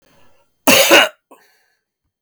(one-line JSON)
{"cough_length": "2.2 s", "cough_amplitude": 32768, "cough_signal_mean_std_ratio": 0.36, "survey_phase": "beta (2021-08-13 to 2022-03-07)", "age": "45-64", "gender": "Male", "wearing_mask": "No", "symptom_cough_any": true, "symptom_runny_or_blocked_nose": true, "symptom_abdominal_pain": true, "symptom_diarrhoea": true, "symptom_fatigue": true, "symptom_fever_high_temperature": true, "symptom_headache": true, "symptom_change_to_sense_of_smell_or_taste": true, "symptom_loss_of_taste": true, "symptom_onset": "4 days", "smoker_status": "Never smoked", "respiratory_condition_asthma": false, "respiratory_condition_other": false, "recruitment_source": "Test and Trace", "submission_delay": "1 day", "covid_test_result": "Negative", "covid_test_method": "RT-qPCR"}